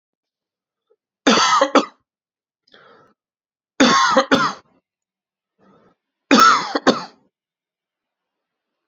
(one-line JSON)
{"three_cough_length": "8.9 s", "three_cough_amplitude": 32768, "three_cough_signal_mean_std_ratio": 0.35, "survey_phase": "beta (2021-08-13 to 2022-03-07)", "age": "18-44", "gender": "Male", "wearing_mask": "No", "symptom_none": true, "smoker_status": "Never smoked", "respiratory_condition_asthma": false, "respiratory_condition_other": false, "recruitment_source": "REACT", "submission_delay": "1 day", "covid_test_result": "Negative", "covid_test_method": "RT-qPCR"}